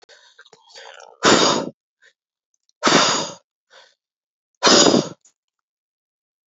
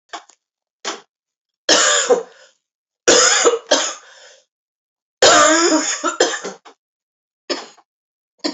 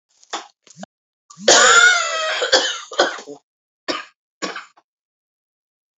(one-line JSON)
{"exhalation_length": "6.5 s", "exhalation_amplitude": 32513, "exhalation_signal_mean_std_ratio": 0.35, "three_cough_length": "8.5 s", "three_cough_amplitude": 32768, "three_cough_signal_mean_std_ratio": 0.44, "cough_length": "6.0 s", "cough_amplitude": 31716, "cough_signal_mean_std_ratio": 0.4, "survey_phase": "alpha (2021-03-01 to 2021-08-12)", "age": "45-64", "gender": "Female", "wearing_mask": "No", "symptom_cough_any": true, "symptom_shortness_of_breath": true, "symptom_fatigue": true, "symptom_headache": true, "symptom_change_to_sense_of_smell_or_taste": true, "symptom_loss_of_taste": true, "symptom_onset": "6 days", "smoker_status": "Ex-smoker", "respiratory_condition_asthma": false, "respiratory_condition_other": false, "recruitment_source": "Test and Trace", "submission_delay": "2 days", "covid_test_result": "Positive", "covid_test_method": "RT-qPCR"}